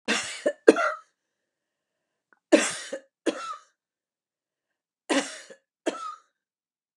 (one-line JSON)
{"three_cough_length": "7.0 s", "three_cough_amplitude": 32404, "three_cough_signal_mean_std_ratio": 0.28, "survey_phase": "beta (2021-08-13 to 2022-03-07)", "age": "65+", "gender": "Female", "wearing_mask": "No", "symptom_none": true, "smoker_status": "Ex-smoker", "respiratory_condition_asthma": false, "respiratory_condition_other": false, "recruitment_source": "REACT", "submission_delay": "0 days", "covid_test_result": "Negative", "covid_test_method": "RT-qPCR", "influenza_a_test_result": "Negative", "influenza_b_test_result": "Negative"}